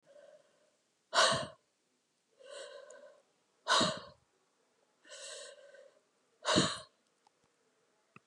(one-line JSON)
{"exhalation_length": "8.3 s", "exhalation_amplitude": 7965, "exhalation_signal_mean_std_ratio": 0.3, "survey_phase": "alpha (2021-03-01 to 2021-08-12)", "age": "65+", "gender": "Female", "wearing_mask": "No", "symptom_headache": true, "symptom_onset": "8 days", "smoker_status": "Never smoked", "respiratory_condition_asthma": false, "respiratory_condition_other": false, "recruitment_source": "REACT", "submission_delay": "1 day", "covid_test_result": "Negative", "covid_test_method": "RT-qPCR"}